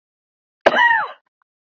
{"cough_length": "1.6 s", "cough_amplitude": 26821, "cough_signal_mean_std_ratio": 0.39, "survey_phase": "beta (2021-08-13 to 2022-03-07)", "age": "18-44", "gender": "Male", "wearing_mask": "No", "symptom_fever_high_temperature": true, "symptom_headache": true, "symptom_onset": "3 days", "smoker_status": "Never smoked", "respiratory_condition_asthma": true, "respiratory_condition_other": false, "recruitment_source": "REACT", "submission_delay": "1 day", "covid_test_result": "Negative", "covid_test_method": "RT-qPCR"}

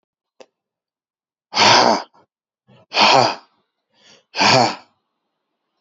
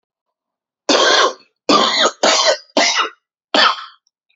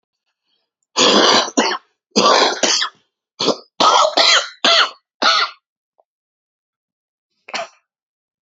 {"exhalation_length": "5.8 s", "exhalation_amplitude": 31896, "exhalation_signal_mean_std_ratio": 0.37, "three_cough_length": "4.4 s", "three_cough_amplitude": 32767, "three_cough_signal_mean_std_ratio": 0.55, "cough_length": "8.4 s", "cough_amplitude": 32767, "cough_signal_mean_std_ratio": 0.47, "survey_phase": "alpha (2021-03-01 to 2021-08-12)", "age": "18-44", "gender": "Male", "wearing_mask": "No", "symptom_cough_any": true, "symptom_abdominal_pain": true, "symptom_diarrhoea": true, "symptom_fatigue": true, "symptom_fever_high_temperature": true, "symptom_headache": true, "symptom_change_to_sense_of_smell_or_taste": true, "symptom_loss_of_taste": true, "symptom_onset": "3 days", "smoker_status": "Never smoked", "respiratory_condition_asthma": false, "respiratory_condition_other": false, "recruitment_source": "Test and Trace", "submission_delay": "2 days", "covid_test_result": "Positive", "covid_test_method": "RT-qPCR"}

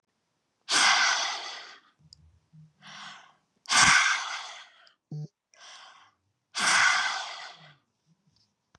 {"exhalation_length": "8.8 s", "exhalation_amplitude": 15581, "exhalation_signal_mean_std_ratio": 0.42, "survey_phase": "beta (2021-08-13 to 2022-03-07)", "age": "45-64", "gender": "Female", "wearing_mask": "No", "symptom_none": true, "smoker_status": "Ex-smoker", "respiratory_condition_asthma": false, "respiratory_condition_other": false, "recruitment_source": "REACT", "submission_delay": "1 day", "covid_test_result": "Negative", "covid_test_method": "RT-qPCR", "influenza_a_test_result": "Negative", "influenza_b_test_result": "Negative"}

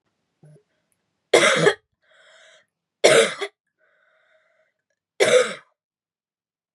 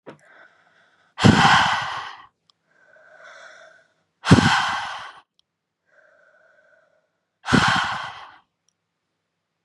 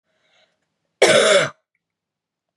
{"three_cough_length": "6.7 s", "three_cough_amplitude": 31353, "three_cough_signal_mean_std_ratio": 0.3, "exhalation_length": "9.6 s", "exhalation_amplitude": 32613, "exhalation_signal_mean_std_ratio": 0.34, "cough_length": "2.6 s", "cough_amplitude": 32029, "cough_signal_mean_std_ratio": 0.35, "survey_phase": "beta (2021-08-13 to 2022-03-07)", "age": "18-44", "gender": "Female", "wearing_mask": "No", "symptom_cough_any": true, "symptom_runny_or_blocked_nose": true, "symptom_sore_throat": true, "symptom_headache": true, "symptom_other": true, "symptom_onset": "5 days", "smoker_status": "Never smoked", "respiratory_condition_asthma": false, "respiratory_condition_other": false, "recruitment_source": "Test and Trace", "submission_delay": "1 day", "covid_test_result": "Positive", "covid_test_method": "RT-qPCR", "covid_ct_value": 18.6, "covid_ct_gene": "ORF1ab gene"}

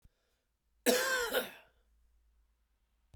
{"cough_length": "3.2 s", "cough_amplitude": 8282, "cough_signal_mean_std_ratio": 0.35, "survey_phase": "beta (2021-08-13 to 2022-03-07)", "age": "45-64", "gender": "Male", "wearing_mask": "No", "symptom_cough_any": true, "symptom_shortness_of_breath": true, "symptom_sore_throat": true, "symptom_fatigue": true, "symptom_headache": true, "symptom_change_to_sense_of_smell_or_taste": true, "symptom_loss_of_taste": true, "symptom_onset": "33 days", "smoker_status": "Ex-smoker", "respiratory_condition_asthma": false, "respiratory_condition_other": false, "recruitment_source": "Test and Trace", "submission_delay": "2 days", "covid_test_result": "Positive", "covid_test_method": "RT-qPCR", "covid_ct_value": 25.4, "covid_ct_gene": "ORF1ab gene"}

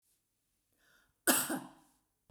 {"cough_length": "2.3 s", "cough_amplitude": 7185, "cough_signal_mean_std_ratio": 0.28, "survey_phase": "beta (2021-08-13 to 2022-03-07)", "age": "45-64", "gender": "Female", "wearing_mask": "No", "symptom_none": true, "smoker_status": "Never smoked", "respiratory_condition_asthma": false, "respiratory_condition_other": false, "recruitment_source": "REACT", "submission_delay": "1 day", "covid_test_result": "Negative", "covid_test_method": "RT-qPCR", "influenza_a_test_result": "Negative", "influenza_b_test_result": "Negative"}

